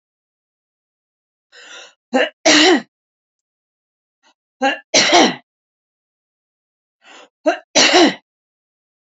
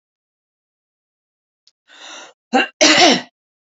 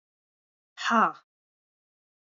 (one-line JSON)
{"three_cough_length": "9.0 s", "three_cough_amplitude": 31802, "three_cough_signal_mean_std_ratio": 0.33, "cough_length": "3.8 s", "cough_amplitude": 30789, "cough_signal_mean_std_ratio": 0.31, "exhalation_length": "2.3 s", "exhalation_amplitude": 13224, "exhalation_signal_mean_std_ratio": 0.26, "survey_phase": "beta (2021-08-13 to 2022-03-07)", "age": "65+", "gender": "Female", "wearing_mask": "No", "symptom_cough_any": true, "symptom_runny_or_blocked_nose": true, "symptom_onset": "8 days", "smoker_status": "Ex-smoker", "respiratory_condition_asthma": false, "respiratory_condition_other": false, "recruitment_source": "REACT", "submission_delay": "0 days", "covid_test_result": "Positive", "covid_test_method": "RT-qPCR", "covid_ct_value": 20.4, "covid_ct_gene": "E gene", "influenza_a_test_result": "Negative", "influenza_b_test_result": "Negative"}